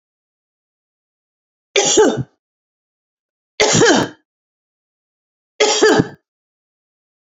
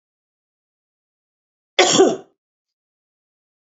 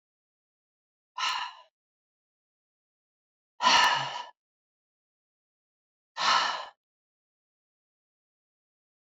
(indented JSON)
{
  "three_cough_length": "7.3 s",
  "three_cough_amplitude": 32767,
  "three_cough_signal_mean_std_ratio": 0.35,
  "cough_length": "3.8 s",
  "cough_amplitude": 29550,
  "cough_signal_mean_std_ratio": 0.24,
  "exhalation_length": "9.0 s",
  "exhalation_amplitude": 10838,
  "exhalation_signal_mean_std_ratio": 0.28,
  "survey_phase": "beta (2021-08-13 to 2022-03-07)",
  "age": "45-64",
  "gender": "Female",
  "wearing_mask": "No",
  "symptom_none": true,
  "smoker_status": "Ex-smoker",
  "respiratory_condition_asthma": false,
  "respiratory_condition_other": false,
  "recruitment_source": "REACT",
  "submission_delay": "1 day",
  "covid_test_result": "Negative",
  "covid_test_method": "RT-qPCR",
  "influenza_a_test_result": "Negative",
  "influenza_b_test_result": "Negative"
}